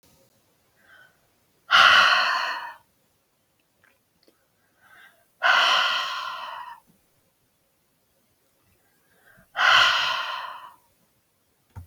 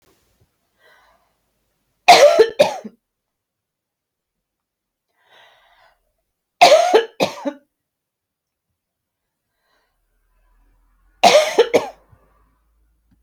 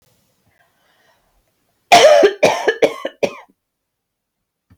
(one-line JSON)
{"exhalation_length": "11.9 s", "exhalation_amplitude": 25244, "exhalation_signal_mean_std_ratio": 0.37, "three_cough_length": "13.2 s", "three_cough_amplitude": 32768, "three_cough_signal_mean_std_ratio": 0.27, "cough_length": "4.8 s", "cough_amplitude": 32768, "cough_signal_mean_std_ratio": 0.34, "survey_phase": "beta (2021-08-13 to 2022-03-07)", "age": "45-64", "gender": "Female", "wearing_mask": "No", "symptom_none": true, "smoker_status": "Never smoked", "respiratory_condition_asthma": false, "respiratory_condition_other": false, "recruitment_source": "REACT", "submission_delay": "3 days", "covid_test_result": "Negative", "covid_test_method": "RT-qPCR"}